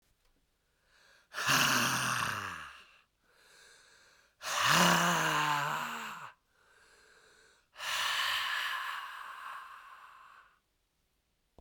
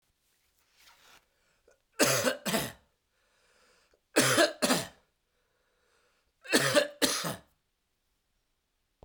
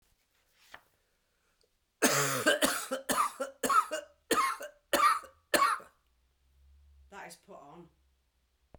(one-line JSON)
{"exhalation_length": "11.6 s", "exhalation_amplitude": 7586, "exhalation_signal_mean_std_ratio": 0.51, "three_cough_length": "9.0 s", "three_cough_amplitude": 11433, "three_cough_signal_mean_std_ratio": 0.35, "cough_length": "8.8 s", "cough_amplitude": 10372, "cough_signal_mean_std_ratio": 0.42, "survey_phase": "beta (2021-08-13 to 2022-03-07)", "age": "45-64", "gender": "Male", "wearing_mask": "No", "symptom_cough_any": true, "symptom_new_continuous_cough": true, "symptom_runny_or_blocked_nose": true, "symptom_shortness_of_breath": true, "symptom_sore_throat": true, "symptom_fatigue": true, "symptom_fever_high_temperature": true, "symptom_headache": true, "symptom_onset": "3 days", "smoker_status": "Never smoked", "respiratory_condition_asthma": false, "respiratory_condition_other": false, "recruitment_source": "Test and Trace", "submission_delay": "1 day", "covid_test_result": "Positive", "covid_test_method": "RT-qPCR", "covid_ct_value": 18.6, "covid_ct_gene": "ORF1ab gene", "covid_ct_mean": 19.4, "covid_viral_load": "420000 copies/ml", "covid_viral_load_category": "Low viral load (10K-1M copies/ml)"}